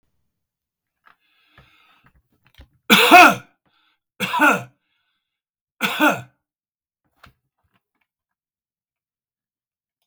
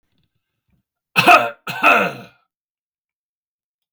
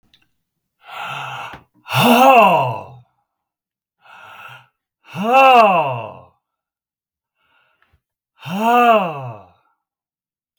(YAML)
three_cough_length: 10.1 s
three_cough_amplitude: 32768
three_cough_signal_mean_std_ratio: 0.24
cough_length: 3.9 s
cough_amplitude: 32768
cough_signal_mean_std_ratio: 0.31
exhalation_length: 10.6 s
exhalation_amplitude: 32768
exhalation_signal_mean_std_ratio: 0.4
survey_phase: beta (2021-08-13 to 2022-03-07)
age: 65+
gender: Male
wearing_mask: 'No'
symptom_none: true
smoker_status: Never smoked
respiratory_condition_asthma: false
respiratory_condition_other: false
recruitment_source: REACT
submission_delay: 1 day
covid_test_result: Negative
covid_test_method: RT-qPCR
influenza_a_test_result: Negative
influenza_b_test_result: Negative